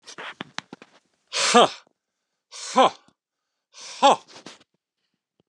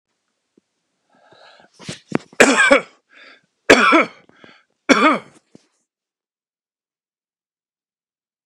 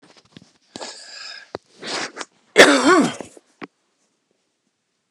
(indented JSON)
{
  "exhalation_length": "5.5 s",
  "exhalation_amplitude": 29122,
  "exhalation_signal_mean_std_ratio": 0.28,
  "three_cough_length": "8.5 s",
  "three_cough_amplitude": 32768,
  "three_cough_signal_mean_std_ratio": 0.28,
  "cough_length": "5.1 s",
  "cough_amplitude": 32768,
  "cough_signal_mean_std_ratio": 0.3,
  "survey_phase": "beta (2021-08-13 to 2022-03-07)",
  "age": "45-64",
  "gender": "Male",
  "wearing_mask": "No",
  "symptom_cough_any": true,
  "symptom_other": true,
  "symptom_onset": "11 days",
  "smoker_status": "Never smoked",
  "respiratory_condition_asthma": false,
  "respiratory_condition_other": false,
  "recruitment_source": "REACT",
  "submission_delay": "3 days",
  "covid_test_result": "Positive",
  "covid_test_method": "RT-qPCR",
  "covid_ct_value": 23.0,
  "covid_ct_gene": "E gene",
  "influenza_a_test_result": "Negative",
  "influenza_b_test_result": "Negative"
}